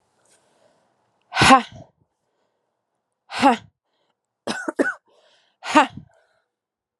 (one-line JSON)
{"exhalation_length": "7.0 s", "exhalation_amplitude": 32660, "exhalation_signal_mean_std_ratio": 0.26, "survey_phase": "alpha (2021-03-01 to 2021-08-12)", "age": "18-44", "gender": "Female", "wearing_mask": "No", "symptom_cough_any": true, "symptom_fatigue": true, "symptom_headache": true, "symptom_change_to_sense_of_smell_or_taste": true, "symptom_loss_of_taste": true, "symptom_onset": "5 days", "smoker_status": "Never smoked", "respiratory_condition_asthma": false, "respiratory_condition_other": false, "recruitment_source": "Test and Trace", "submission_delay": "2 days", "covid_test_result": "Positive", "covid_test_method": "RT-qPCR"}